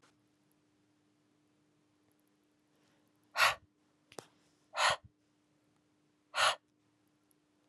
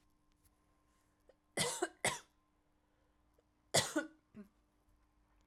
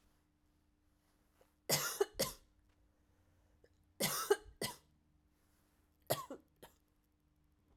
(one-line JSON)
{"exhalation_length": "7.7 s", "exhalation_amplitude": 5768, "exhalation_signal_mean_std_ratio": 0.22, "cough_length": "5.5 s", "cough_amplitude": 4681, "cough_signal_mean_std_ratio": 0.28, "three_cough_length": "7.8 s", "three_cough_amplitude": 3803, "three_cough_signal_mean_std_ratio": 0.28, "survey_phase": "alpha (2021-03-01 to 2021-08-12)", "age": "18-44", "gender": "Female", "wearing_mask": "No", "symptom_cough_any": true, "symptom_fatigue": true, "symptom_fever_high_temperature": true, "symptom_headache": true, "symptom_change_to_sense_of_smell_or_taste": true, "symptom_loss_of_taste": true, "symptom_onset": "3 days", "smoker_status": "Ex-smoker", "respiratory_condition_asthma": false, "respiratory_condition_other": false, "recruitment_source": "Test and Trace", "submission_delay": "2 days", "covid_test_result": "Positive", "covid_test_method": "RT-qPCR", "covid_ct_value": 15.4, "covid_ct_gene": "ORF1ab gene", "covid_ct_mean": 16.6, "covid_viral_load": "3600000 copies/ml", "covid_viral_load_category": "High viral load (>1M copies/ml)"}